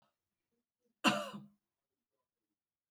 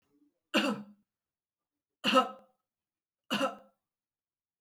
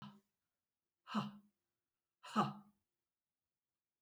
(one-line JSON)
{"cough_length": "2.9 s", "cough_amplitude": 5920, "cough_signal_mean_std_ratio": 0.21, "three_cough_length": "4.6 s", "three_cough_amplitude": 8794, "three_cough_signal_mean_std_ratio": 0.3, "exhalation_length": "4.0 s", "exhalation_amplitude": 2508, "exhalation_signal_mean_std_ratio": 0.26, "survey_phase": "alpha (2021-03-01 to 2021-08-12)", "age": "65+", "gender": "Female", "wearing_mask": "No", "symptom_none": true, "symptom_onset": "13 days", "smoker_status": "Never smoked", "respiratory_condition_asthma": false, "respiratory_condition_other": false, "recruitment_source": "REACT", "submission_delay": "1 day", "covid_test_result": "Negative", "covid_test_method": "RT-qPCR"}